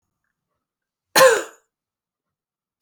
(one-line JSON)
{"cough_length": "2.8 s", "cough_amplitude": 27101, "cough_signal_mean_std_ratio": 0.24, "survey_phase": "beta (2021-08-13 to 2022-03-07)", "age": "45-64", "gender": "Female", "wearing_mask": "No", "symptom_cough_any": true, "symptom_runny_or_blocked_nose": true, "symptom_fatigue": true, "symptom_headache": true, "symptom_onset": "3 days", "smoker_status": "Never smoked", "respiratory_condition_asthma": false, "respiratory_condition_other": false, "recruitment_source": "Test and Trace", "submission_delay": "2 days", "covid_test_result": "Positive", "covid_test_method": "ePCR"}